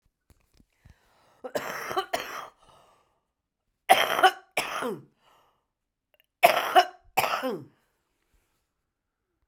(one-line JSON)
{"three_cough_length": "9.5 s", "three_cough_amplitude": 30756, "three_cough_signal_mean_std_ratio": 0.3, "survey_phase": "alpha (2021-03-01 to 2021-08-12)", "age": "65+", "gender": "Female", "wearing_mask": "No", "symptom_headache": true, "smoker_status": "Never smoked", "respiratory_condition_asthma": true, "respiratory_condition_other": false, "recruitment_source": "Test and Trace", "submission_delay": "1 day", "covid_test_result": "Positive", "covid_test_method": "RT-qPCR", "covid_ct_value": 15.9, "covid_ct_gene": "ORF1ab gene", "covid_ct_mean": 16.6, "covid_viral_load": "3600000 copies/ml", "covid_viral_load_category": "High viral load (>1M copies/ml)"}